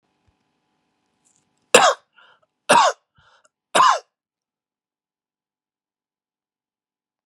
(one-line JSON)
{"three_cough_length": "7.3 s", "three_cough_amplitude": 32768, "three_cough_signal_mean_std_ratio": 0.23, "survey_phase": "beta (2021-08-13 to 2022-03-07)", "age": "45-64", "gender": "Male", "wearing_mask": "No", "symptom_cough_any": true, "symptom_runny_or_blocked_nose": true, "symptom_fatigue": true, "symptom_fever_high_temperature": true, "symptom_headache": true, "symptom_change_to_sense_of_smell_or_taste": true, "symptom_onset": "4 days", "smoker_status": "Ex-smoker", "respiratory_condition_asthma": false, "respiratory_condition_other": false, "recruitment_source": "Test and Trace", "submission_delay": "1 day", "covid_test_result": "Positive", "covid_test_method": "RT-qPCR", "covid_ct_value": 13.8, "covid_ct_gene": "ORF1ab gene", "covid_ct_mean": 14.0, "covid_viral_load": "25000000 copies/ml", "covid_viral_load_category": "High viral load (>1M copies/ml)"}